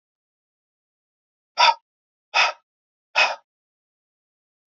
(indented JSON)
{
  "exhalation_length": "4.7 s",
  "exhalation_amplitude": 22625,
  "exhalation_signal_mean_std_ratio": 0.25,
  "survey_phase": "beta (2021-08-13 to 2022-03-07)",
  "age": "45-64",
  "gender": "Male",
  "wearing_mask": "No",
  "symptom_fatigue": true,
  "symptom_onset": "4 days",
  "smoker_status": "Never smoked",
  "respiratory_condition_asthma": false,
  "respiratory_condition_other": false,
  "recruitment_source": "REACT",
  "submission_delay": "1 day",
  "covid_test_result": "Negative",
  "covid_test_method": "RT-qPCR",
  "influenza_a_test_result": "Negative",
  "influenza_b_test_result": "Negative"
}